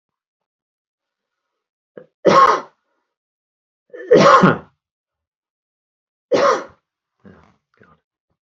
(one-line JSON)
{"three_cough_length": "8.4 s", "three_cough_amplitude": 30338, "three_cough_signal_mean_std_ratio": 0.29, "survey_phase": "beta (2021-08-13 to 2022-03-07)", "age": "45-64", "gender": "Male", "wearing_mask": "No", "symptom_runny_or_blocked_nose": true, "smoker_status": "Never smoked", "respiratory_condition_asthma": false, "respiratory_condition_other": false, "recruitment_source": "REACT", "submission_delay": "5 days", "covid_test_result": "Negative", "covid_test_method": "RT-qPCR"}